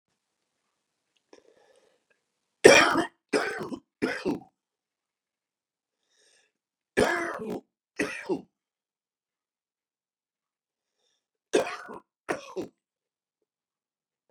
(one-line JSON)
{"three_cough_length": "14.3 s", "three_cough_amplitude": 32131, "three_cough_signal_mean_std_ratio": 0.23, "survey_phase": "beta (2021-08-13 to 2022-03-07)", "age": "65+", "gender": "Male", "wearing_mask": "No", "symptom_none": true, "smoker_status": "Ex-smoker", "respiratory_condition_asthma": false, "respiratory_condition_other": true, "recruitment_source": "REACT", "submission_delay": "0 days", "covid_test_result": "Negative", "covid_test_method": "RT-qPCR", "influenza_a_test_result": "Negative", "influenza_b_test_result": "Negative"}